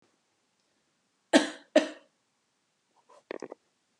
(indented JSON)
{
  "cough_length": "4.0 s",
  "cough_amplitude": 21665,
  "cough_signal_mean_std_ratio": 0.19,
  "survey_phase": "beta (2021-08-13 to 2022-03-07)",
  "age": "18-44",
  "gender": "Female",
  "wearing_mask": "No",
  "symptom_abdominal_pain": true,
  "smoker_status": "Never smoked",
  "respiratory_condition_asthma": false,
  "respiratory_condition_other": false,
  "recruitment_source": "REACT",
  "submission_delay": "2 days",
  "covid_test_result": "Negative",
  "covid_test_method": "RT-qPCR"
}